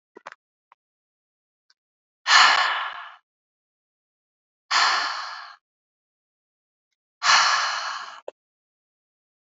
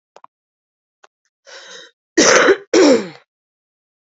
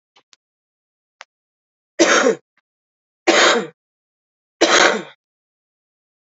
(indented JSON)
{
  "exhalation_length": "9.5 s",
  "exhalation_amplitude": 26226,
  "exhalation_signal_mean_std_ratio": 0.34,
  "cough_length": "4.2 s",
  "cough_amplitude": 32768,
  "cough_signal_mean_std_ratio": 0.35,
  "three_cough_length": "6.3 s",
  "three_cough_amplitude": 32007,
  "three_cough_signal_mean_std_ratio": 0.33,
  "survey_phase": "alpha (2021-03-01 to 2021-08-12)",
  "age": "18-44",
  "gender": "Female",
  "wearing_mask": "No",
  "symptom_cough_any": true,
  "symptom_shortness_of_breath": true,
  "symptom_headache": true,
  "symptom_onset": "3 days",
  "smoker_status": "Current smoker (11 or more cigarettes per day)",
  "respiratory_condition_asthma": true,
  "respiratory_condition_other": false,
  "recruitment_source": "Test and Trace",
  "submission_delay": "2 days",
  "covid_test_result": "Positive",
  "covid_test_method": "RT-qPCR",
  "covid_ct_value": 11.4,
  "covid_ct_gene": "ORF1ab gene",
  "covid_ct_mean": 11.8,
  "covid_viral_load": "140000000 copies/ml",
  "covid_viral_load_category": "High viral load (>1M copies/ml)"
}